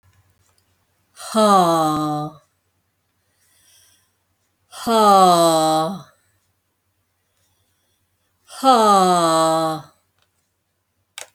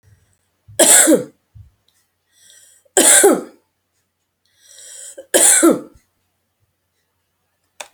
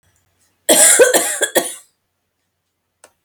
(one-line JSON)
{"exhalation_length": "11.3 s", "exhalation_amplitude": 28997, "exhalation_signal_mean_std_ratio": 0.45, "three_cough_length": "7.9 s", "three_cough_amplitude": 32768, "three_cough_signal_mean_std_ratio": 0.34, "cough_length": "3.2 s", "cough_amplitude": 32768, "cough_signal_mean_std_ratio": 0.4, "survey_phase": "beta (2021-08-13 to 2022-03-07)", "age": "45-64", "gender": "Female", "wearing_mask": "No", "symptom_none": true, "smoker_status": "Ex-smoker", "respiratory_condition_asthma": false, "respiratory_condition_other": false, "recruitment_source": "REACT", "submission_delay": "3 days", "covid_test_result": "Negative", "covid_test_method": "RT-qPCR"}